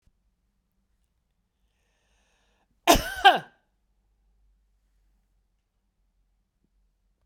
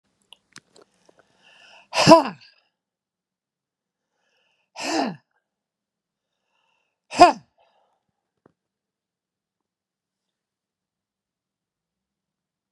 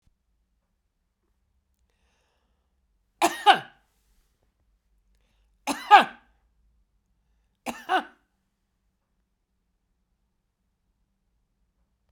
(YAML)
cough_length: 7.3 s
cough_amplitude: 26507
cough_signal_mean_std_ratio: 0.16
exhalation_length: 12.7 s
exhalation_amplitude: 32767
exhalation_signal_mean_std_ratio: 0.16
three_cough_length: 12.1 s
three_cough_amplitude: 30476
three_cough_signal_mean_std_ratio: 0.16
survey_phase: beta (2021-08-13 to 2022-03-07)
age: 65+
gender: Female
wearing_mask: 'No'
symptom_none: true
smoker_status: Ex-smoker
respiratory_condition_asthma: false
respiratory_condition_other: false
recruitment_source: REACT
submission_delay: 2 days
covid_test_result: Negative
covid_test_method: RT-qPCR